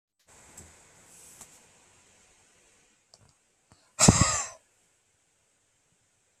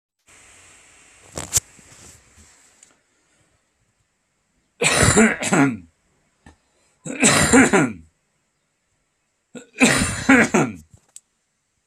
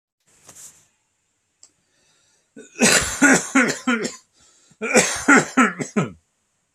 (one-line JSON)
{"exhalation_length": "6.4 s", "exhalation_amplitude": 24089, "exhalation_signal_mean_std_ratio": 0.2, "three_cough_length": "11.9 s", "three_cough_amplitude": 32767, "three_cough_signal_mean_std_ratio": 0.37, "cough_length": "6.7 s", "cough_amplitude": 30115, "cough_signal_mean_std_ratio": 0.41, "survey_phase": "alpha (2021-03-01 to 2021-08-12)", "age": "18-44", "gender": "Male", "wearing_mask": "No", "symptom_none": true, "symptom_headache": true, "smoker_status": "Never smoked", "respiratory_condition_asthma": false, "respiratory_condition_other": false, "recruitment_source": "Test and Trace", "submission_delay": "2 days", "covid_test_result": "Positive", "covid_test_method": "RT-qPCR", "covid_ct_value": 25.5, "covid_ct_gene": "ORF1ab gene", "covid_ct_mean": 26.2, "covid_viral_load": "2500 copies/ml", "covid_viral_load_category": "Minimal viral load (< 10K copies/ml)"}